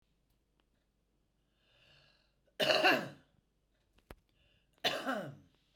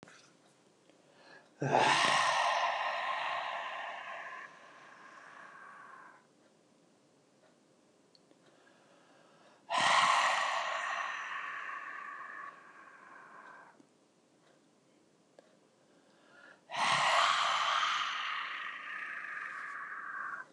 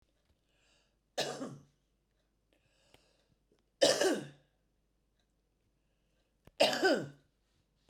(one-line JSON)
{"cough_length": "5.8 s", "cough_amplitude": 6162, "cough_signal_mean_std_ratio": 0.3, "exhalation_length": "20.5 s", "exhalation_amplitude": 7302, "exhalation_signal_mean_std_ratio": 0.53, "three_cough_length": "7.9 s", "three_cough_amplitude": 7925, "three_cough_signal_mean_std_ratio": 0.28, "survey_phase": "beta (2021-08-13 to 2022-03-07)", "age": "45-64", "gender": "Female", "wearing_mask": "No", "symptom_none": true, "smoker_status": "Current smoker (11 or more cigarettes per day)", "respiratory_condition_asthma": false, "respiratory_condition_other": false, "recruitment_source": "REACT", "submission_delay": "2 days", "covid_test_result": "Negative", "covid_test_method": "RT-qPCR", "influenza_a_test_result": "Negative", "influenza_b_test_result": "Negative"}